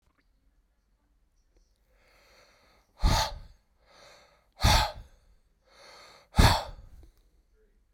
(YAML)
exhalation_length: 7.9 s
exhalation_amplitude: 16389
exhalation_signal_mean_std_ratio: 0.27
survey_phase: beta (2021-08-13 to 2022-03-07)
age: 65+
gender: Male
wearing_mask: 'No'
symptom_none: true
smoker_status: Ex-smoker
respiratory_condition_asthma: false
respiratory_condition_other: false
recruitment_source: Test and Trace
submission_delay: 2 days
covid_test_result: Positive
covid_test_method: RT-qPCR
covid_ct_value: 26.1
covid_ct_gene: ORF1ab gene
covid_ct_mean: 26.8
covid_viral_load: 1600 copies/ml
covid_viral_load_category: Minimal viral load (< 10K copies/ml)